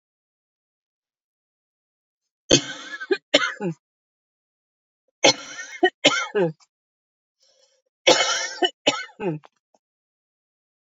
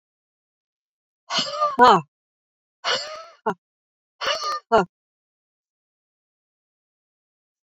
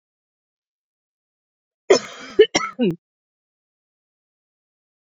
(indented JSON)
{
  "three_cough_length": "10.9 s",
  "three_cough_amplitude": 30942,
  "three_cough_signal_mean_std_ratio": 0.3,
  "exhalation_length": "7.8 s",
  "exhalation_amplitude": 27537,
  "exhalation_signal_mean_std_ratio": 0.28,
  "cough_length": "5.0 s",
  "cough_amplitude": 26867,
  "cough_signal_mean_std_ratio": 0.21,
  "survey_phase": "beta (2021-08-13 to 2022-03-07)",
  "age": "45-64",
  "gender": "Female",
  "wearing_mask": "No",
  "symptom_none": true,
  "symptom_onset": "12 days",
  "smoker_status": "Never smoked",
  "respiratory_condition_asthma": false,
  "respiratory_condition_other": false,
  "recruitment_source": "REACT",
  "submission_delay": "1 day",
  "covid_test_result": "Negative",
  "covid_test_method": "RT-qPCR"
}